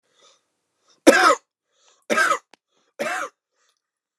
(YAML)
three_cough_length: 4.2 s
three_cough_amplitude: 29204
three_cough_signal_mean_std_ratio: 0.31
survey_phase: alpha (2021-03-01 to 2021-08-12)
age: 45-64
gender: Male
wearing_mask: 'No'
symptom_none: true
symptom_onset: 6 days
smoker_status: Ex-smoker
respiratory_condition_asthma: false
respiratory_condition_other: false
recruitment_source: REACT
submission_delay: 3 days
covid_test_result: Negative
covid_test_method: RT-qPCR